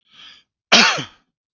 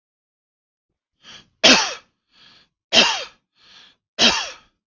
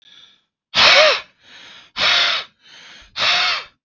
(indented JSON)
{
  "cough_length": "1.5 s",
  "cough_amplitude": 32767,
  "cough_signal_mean_std_ratio": 0.34,
  "three_cough_length": "4.9 s",
  "three_cough_amplitude": 31907,
  "three_cough_signal_mean_std_ratio": 0.31,
  "exhalation_length": "3.8 s",
  "exhalation_amplitude": 32686,
  "exhalation_signal_mean_std_ratio": 0.5,
  "survey_phase": "beta (2021-08-13 to 2022-03-07)",
  "age": "45-64",
  "gender": "Male",
  "wearing_mask": "No",
  "symptom_none": true,
  "symptom_onset": "7 days",
  "smoker_status": "Ex-smoker",
  "respiratory_condition_asthma": false,
  "respiratory_condition_other": false,
  "recruitment_source": "REACT",
  "submission_delay": "1 day",
  "covid_test_result": "Negative",
  "covid_test_method": "RT-qPCR"
}